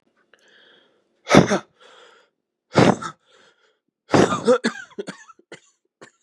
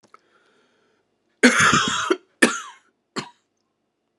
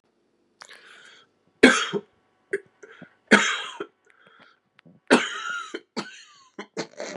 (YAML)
exhalation_length: 6.2 s
exhalation_amplitude: 32768
exhalation_signal_mean_std_ratio: 0.3
cough_length: 4.2 s
cough_amplitude: 32653
cough_signal_mean_std_ratio: 0.34
three_cough_length: 7.2 s
three_cough_amplitude: 32767
three_cough_signal_mean_std_ratio: 0.29
survey_phase: beta (2021-08-13 to 2022-03-07)
age: 45-64
gender: Male
wearing_mask: 'No'
symptom_cough_any: true
symptom_runny_or_blocked_nose: true
symptom_shortness_of_breath: true
symptom_sore_throat: true
symptom_fatigue: true
symptom_headache: true
symptom_other: true
symptom_onset: 4 days
smoker_status: Never smoked
respiratory_condition_asthma: false
respiratory_condition_other: false
recruitment_source: Test and Trace
submission_delay: 3 days
covid_test_result: Positive
covid_test_method: RT-qPCR
covid_ct_value: 14.9
covid_ct_gene: ORF1ab gene
covid_ct_mean: 15.1
covid_viral_load: 11000000 copies/ml
covid_viral_load_category: High viral load (>1M copies/ml)